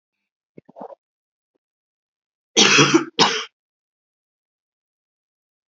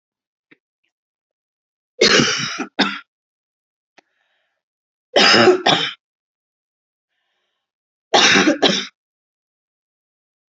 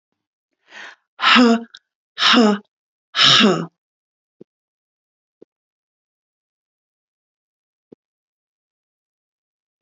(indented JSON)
{
  "cough_length": "5.7 s",
  "cough_amplitude": 32300,
  "cough_signal_mean_std_ratio": 0.27,
  "three_cough_length": "10.5 s",
  "three_cough_amplitude": 32329,
  "three_cough_signal_mean_std_ratio": 0.34,
  "exhalation_length": "9.8 s",
  "exhalation_amplitude": 31108,
  "exhalation_signal_mean_std_ratio": 0.28,
  "survey_phase": "alpha (2021-03-01 to 2021-08-12)",
  "age": "45-64",
  "gender": "Female",
  "wearing_mask": "No",
  "symptom_none": true,
  "smoker_status": "Current smoker (1 to 10 cigarettes per day)",
  "respiratory_condition_asthma": false,
  "respiratory_condition_other": false,
  "recruitment_source": "REACT",
  "submission_delay": "3 days",
  "covid_test_result": "Negative",
  "covid_test_method": "RT-qPCR"
}